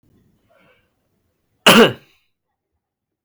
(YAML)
cough_length: 3.2 s
cough_amplitude: 32768
cough_signal_mean_std_ratio: 0.23
survey_phase: beta (2021-08-13 to 2022-03-07)
age: 18-44
gender: Male
wearing_mask: 'No'
symptom_cough_any: true
symptom_sore_throat: true
symptom_headache: true
smoker_status: Never smoked
respiratory_condition_asthma: false
respiratory_condition_other: false
recruitment_source: REACT
submission_delay: 1 day
covid_test_result: Negative
covid_test_method: RT-qPCR
influenza_a_test_result: Negative
influenza_b_test_result: Negative